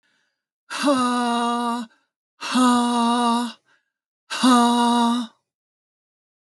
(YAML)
exhalation_length: 6.5 s
exhalation_amplitude: 20040
exhalation_signal_mean_std_ratio: 0.6
survey_phase: alpha (2021-03-01 to 2021-08-12)
age: 45-64
gender: Female
wearing_mask: 'No'
symptom_none: true
smoker_status: Never smoked
respiratory_condition_asthma: false
respiratory_condition_other: false
recruitment_source: REACT
submission_delay: 3 days
covid_test_result: Negative
covid_test_method: RT-qPCR